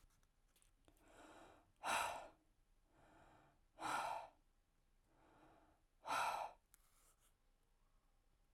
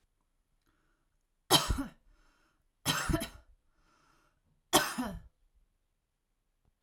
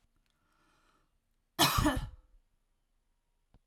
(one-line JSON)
{"exhalation_length": "8.5 s", "exhalation_amplitude": 1200, "exhalation_signal_mean_std_ratio": 0.37, "three_cough_length": "6.8 s", "three_cough_amplitude": 11706, "three_cough_signal_mean_std_ratio": 0.29, "cough_length": "3.7 s", "cough_amplitude": 8087, "cough_signal_mean_std_ratio": 0.28, "survey_phase": "alpha (2021-03-01 to 2021-08-12)", "age": "18-44", "gender": "Female", "wearing_mask": "No", "symptom_none": true, "smoker_status": "Never smoked", "respiratory_condition_asthma": false, "respiratory_condition_other": false, "recruitment_source": "REACT", "submission_delay": "1 day", "covid_test_result": "Negative", "covid_test_method": "RT-qPCR"}